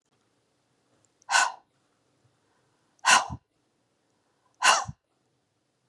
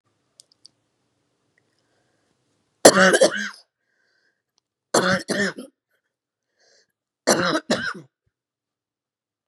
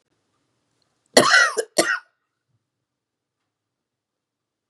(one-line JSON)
{"exhalation_length": "5.9 s", "exhalation_amplitude": 21988, "exhalation_signal_mean_std_ratio": 0.25, "three_cough_length": "9.5 s", "three_cough_amplitude": 32768, "three_cough_signal_mean_std_ratio": 0.28, "cough_length": "4.7 s", "cough_amplitude": 32768, "cough_signal_mean_std_ratio": 0.26, "survey_phase": "beta (2021-08-13 to 2022-03-07)", "age": "45-64", "gender": "Female", "wearing_mask": "No", "symptom_cough_any": true, "symptom_runny_or_blocked_nose": true, "symptom_sore_throat": true, "symptom_fatigue": true, "symptom_fever_high_temperature": true, "symptom_headache": true, "symptom_change_to_sense_of_smell_or_taste": true, "symptom_onset": "3 days", "smoker_status": "Ex-smoker", "respiratory_condition_asthma": false, "respiratory_condition_other": false, "recruitment_source": "Test and Trace", "submission_delay": "2 days", "covid_test_result": "Positive", "covid_test_method": "RT-qPCR", "covid_ct_value": 13.2, "covid_ct_gene": "N gene"}